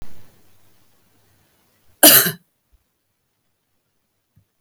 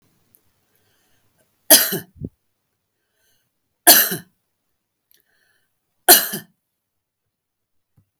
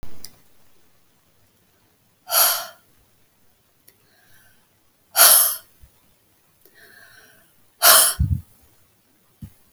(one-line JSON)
{"cough_length": "4.6 s", "cough_amplitude": 32768, "cough_signal_mean_std_ratio": 0.22, "three_cough_length": "8.2 s", "three_cough_amplitude": 32768, "three_cough_signal_mean_std_ratio": 0.21, "exhalation_length": "9.7 s", "exhalation_amplitude": 32768, "exhalation_signal_mean_std_ratio": 0.29, "survey_phase": "beta (2021-08-13 to 2022-03-07)", "age": "45-64", "gender": "Female", "wearing_mask": "No", "symptom_none": true, "smoker_status": "Never smoked", "respiratory_condition_asthma": false, "respiratory_condition_other": false, "recruitment_source": "REACT", "submission_delay": "11 days", "covid_test_result": "Negative", "covid_test_method": "RT-qPCR"}